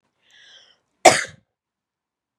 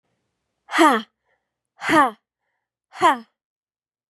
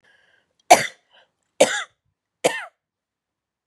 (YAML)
cough_length: 2.4 s
cough_amplitude: 32768
cough_signal_mean_std_ratio: 0.18
exhalation_length: 4.1 s
exhalation_amplitude: 28932
exhalation_signal_mean_std_ratio: 0.31
three_cough_length: 3.7 s
three_cough_amplitude: 32768
three_cough_signal_mean_std_ratio: 0.22
survey_phase: beta (2021-08-13 to 2022-03-07)
age: 18-44
gender: Female
wearing_mask: 'No'
symptom_none: true
symptom_onset: 12 days
smoker_status: Never smoked
respiratory_condition_asthma: false
respiratory_condition_other: false
recruitment_source: REACT
submission_delay: 2 days
covid_test_result: Negative
covid_test_method: RT-qPCR
influenza_a_test_result: Negative
influenza_b_test_result: Negative